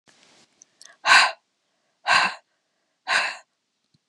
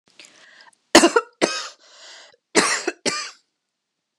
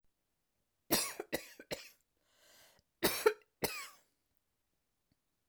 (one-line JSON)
{"exhalation_length": "4.1 s", "exhalation_amplitude": 27879, "exhalation_signal_mean_std_ratio": 0.32, "cough_length": "4.2 s", "cough_amplitude": 32768, "cough_signal_mean_std_ratio": 0.32, "three_cough_length": "5.5 s", "three_cough_amplitude": 7309, "three_cough_signal_mean_std_ratio": 0.27, "survey_phase": "alpha (2021-03-01 to 2021-08-12)", "age": "45-64", "gender": "Female", "wearing_mask": "No", "symptom_none": true, "smoker_status": "Never smoked", "respiratory_condition_asthma": false, "respiratory_condition_other": false, "recruitment_source": "REACT", "submission_delay": "1 day", "covid_test_result": "Negative", "covid_test_method": "RT-qPCR"}